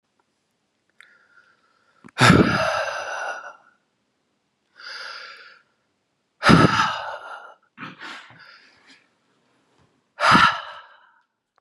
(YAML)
exhalation_length: 11.6 s
exhalation_amplitude: 32767
exhalation_signal_mean_std_ratio: 0.33
survey_phase: beta (2021-08-13 to 2022-03-07)
age: 45-64
gender: Male
wearing_mask: 'No'
symptom_cough_any: true
symptom_runny_or_blocked_nose: true
symptom_fatigue: true
symptom_fever_high_temperature: true
symptom_loss_of_taste: true
symptom_onset: 2 days
smoker_status: Ex-smoker
respiratory_condition_asthma: false
respiratory_condition_other: false
recruitment_source: Test and Trace
submission_delay: 1 day
covid_test_result: Positive
covid_test_method: ePCR